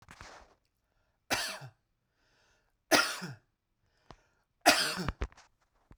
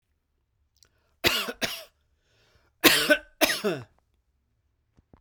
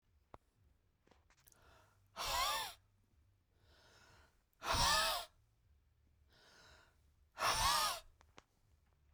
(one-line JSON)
{"three_cough_length": "6.0 s", "three_cough_amplitude": 13949, "three_cough_signal_mean_std_ratio": 0.29, "cough_length": "5.2 s", "cough_amplitude": 25167, "cough_signal_mean_std_ratio": 0.31, "exhalation_length": "9.1 s", "exhalation_amplitude": 2873, "exhalation_signal_mean_std_ratio": 0.38, "survey_phase": "beta (2021-08-13 to 2022-03-07)", "age": "18-44", "gender": "Male", "wearing_mask": "No", "symptom_none": true, "smoker_status": "Never smoked", "respiratory_condition_asthma": false, "respiratory_condition_other": false, "recruitment_source": "Test and Trace", "submission_delay": "2 days", "covid_test_result": "Positive", "covid_test_method": "RT-qPCR", "covid_ct_value": 29.8, "covid_ct_gene": "N gene"}